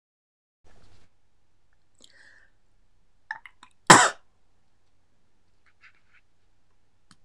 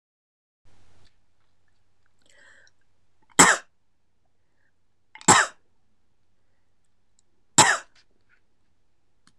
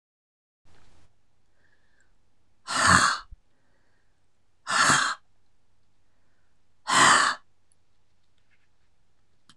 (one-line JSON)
{"cough_length": "7.2 s", "cough_amplitude": 26028, "cough_signal_mean_std_ratio": 0.17, "three_cough_length": "9.4 s", "three_cough_amplitude": 26028, "three_cough_signal_mean_std_ratio": 0.21, "exhalation_length": "9.6 s", "exhalation_amplitude": 25650, "exhalation_signal_mean_std_ratio": 0.33, "survey_phase": "beta (2021-08-13 to 2022-03-07)", "age": "65+", "gender": "Female", "wearing_mask": "No", "symptom_none": true, "smoker_status": "Ex-smoker", "respiratory_condition_asthma": false, "respiratory_condition_other": false, "recruitment_source": "REACT", "submission_delay": "1 day", "covid_test_result": "Negative", "covid_test_method": "RT-qPCR"}